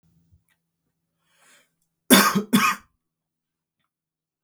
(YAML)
cough_length: 4.4 s
cough_amplitude: 32766
cough_signal_mean_std_ratio: 0.26
survey_phase: beta (2021-08-13 to 2022-03-07)
age: 18-44
gender: Male
wearing_mask: 'No'
symptom_none: true
smoker_status: Never smoked
respiratory_condition_asthma: false
respiratory_condition_other: false
recruitment_source: REACT
submission_delay: 1 day
covid_test_result: Negative
covid_test_method: RT-qPCR